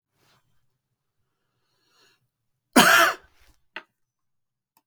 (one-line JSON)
{"cough_length": "4.9 s", "cough_amplitude": 32766, "cough_signal_mean_std_ratio": 0.22, "survey_phase": "beta (2021-08-13 to 2022-03-07)", "age": "45-64", "gender": "Male", "wearing_mask": "No", "symptom_none": true, "smoker_status": "Never smoked", "respiratory_condition_asthma": false, "respiratory_condition_other": false, "recruitment_source": "REACT", "submission_delay": "3 days", "covid_test_result": "Negative", "covid_test_method": "RT-qPCR", "influenza_a_test_result": "Negative", "influenza_b_test_result": "Negative"}